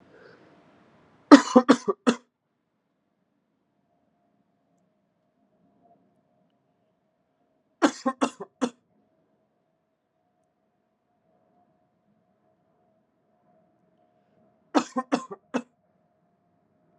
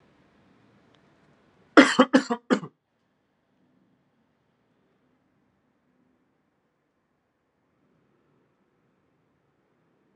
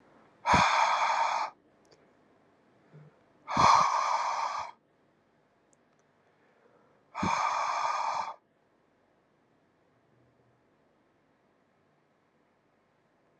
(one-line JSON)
{"three_cough_length": "17.0 s", "three_cough_amplitude": 32750, "three_cough_signal_mean_std_ratio": 0.15, "cough_length": "10.2 s", "cough_amplitude": 32560, "cough_signal_mean_std_ratio": 0.15, "exhalation_length": "13.4 s", "exhalation_amplitude": 11495, "exhalation_signal_mean_std_ratio": 0.4, "survey_phase": "alpha (2021-03-01 to 2021-08-12)", "age": "18-44", "gender": "Male", "wearing_mask": "No", "symptom_cough_any": true, "symptom_fatigue": true, "symptom_change_to_sense_of_smell_or_taste": true, "symptom_loss_of_taste": true, "symptom_onset": "2 days", "smoker_status": "Never smoked", "respiratory_condition_asthma": false, "respiratory_condition_other": false, "recruitment_source": "Test and Trace", "submission_delay": "2 days", "covid_test_result": "Positive", "covid_test_method": "RT-qPCR", "covid_ct_value": 13.0, "covid_ct_gene": "N gene", "covid_ct_mean": 14.5, "covid_viral_load": "17000000 copies/ml", "covid_viral_load_category": "High viral load (>1M copies/ml)"}